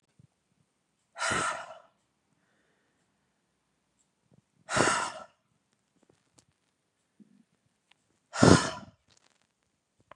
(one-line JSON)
{"exhalation_length": "10.2 s", "exhalation_amplitude": 25510, "exhalation_signal_mean_std_ratio": 0.22, "survey_phase": "beta (2021-08-13 to 2022-03-07)", "age": "45-64", "gender": "Female", "wearing_mask": "No", "symptom_none": true, "smoker_status": "Current smoker (e-cigarettes or vapes only)", "respiratory_condition_asthma": false, "respiratory_condition_other": false, "recruitment_source": "Test and Trace", "submission_delay": "0 days", "covid_test_result": "Negative", "covid_test_method": "LFT"}